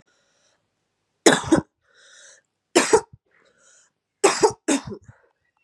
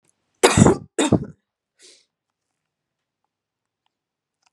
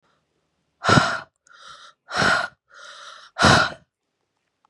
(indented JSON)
{
  "three_cough_length": "5.6 s",
  "three_cough_amplitude": 32619,
  "three_cough_signal_mean_std_ratio": 0.29,
  "cough_length": "4.5 s",
  "cough_amplitude": 32768,
  "cough_signal_mean_std_ratio": 0.25,
  "exhalation_length": "4.7 s",
  "exhalation_amplitude": 31328,
  "exhalation_signal_mean_std_ratio": 0.37,
  "survey_phase": "beta (2021-08-13 to 2022-03-07)",
  "age": "18-44",
  "gender": "Female",
  "wearing_mask": "No",
  "symptom_new_continuous_cough": true,
  "symptom_runny_or_blocked_nose": true,
  "symptom_sore_throat": true,
  "symptom_abdominal_pain": true,
  "symptom_fatigue": true,
  "symptom_fever_high_temperature": true,
  "symptom_headache": true,
  "symptom_change_to_sense_of_smell_or_taste": true,
  "symptom_onset": "4 days",
  "smoker_status": "Never smoked",
  "respiratory_condition_asthma": false,
  "respiratory_condition_other": false,
  "recruitment_source": "Test and Trace",
  "submission_delay": "2 days",
  "covid_test_result": "Positive",
  "covid_test_method": "ePCR"
}